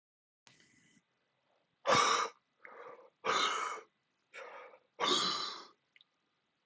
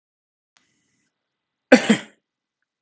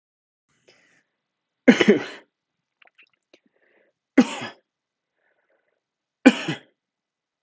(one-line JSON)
{"exhalation_length": "6.7 s", "exhalation_amplitude": 5265, "exhalation_signal_mean_std_ratio": 0.4, "cough_length": "2.8 s", "cough_amplitude": 32768, "cough_signal_mean_std_ratio": 0.18, "three_cough_length": "7.4 s", "three_cough_amplitude": 32766, "three_cough_signal_mean_std_ratio": 0.2, "survey_phase": "beta (2021-08-13 to 2022-03-07)", "age": "18-44", "gender": "Male", "wearing_mask": "No", "symptom_cough_any": true, "symptom_runny_or_blocked_nose": true, "symptom_fatigue": true, "symptom_headache": true, "symptom_onset": "2 days", "smoker_status": "Ex-smoker", "respiratory_condition_asthma": false, "respiratory_condition_other": false, "recruitment_source": "Test and Trace", "submission_delay": "1 day", "covid_test_result": "Positive", "covid_test_method": "RT-qPCR"}